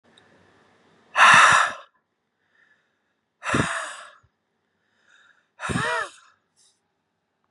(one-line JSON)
{"exhalation_length": "7.5 s", "exhalation_amplitude": 28335, "exhalation_signal_mean_std_ratio": 0.3, "survey_phase": "beta (2021-08-13 to 2022-03-07)", "age": "18-44", "gender": "Male", "wearing_mask": "No", "symptom_cough_any": true, "symptom_new_continuous_cough": true, "symptom_sore_throat": true, "symptom_onset": "2 days", "smoker_status": "Ex-smoker", "respiratory_condition_asthma": false, "respiratory_condition_other": false, "recruitment_source": "Test and Trace", "submission_delay": "1 day", "covid_test_method": "RT-qPCR"}